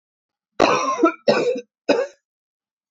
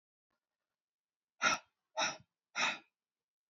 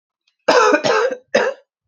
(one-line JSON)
{"three_cough_length": "2.9 s", "three_cough_amplitude": 27367, "three_cough_signal_mean_std_ratio": 0.47, "exhalation_length": "3.5 s", "exhalation_amplitude": 4893, "exhalation_signal_mean_std_ratio": 0.3, "cough_length": "1.9 s", "cough_amplitude": 28422, "cough_signal_mean_std_ratio": 0.57, "survey_phase": "alpha (2021-03-01 to 2021-08-12)", "age": "45-64", "gender": "Female", "wearing_mask": "No", "symptom_cough_any": true, "symptom_headache": true, "symptom_onset": "3 days", "smoker_status": "Ex-smoker", "respiratory_condition_asthma": false, "respiratory_condition_other": false, "recruitment_source": "Test and Trace", "submission_delay": "2 days", "covid_test_result": "Positive", "covid_test_method": "RT-qPCR"}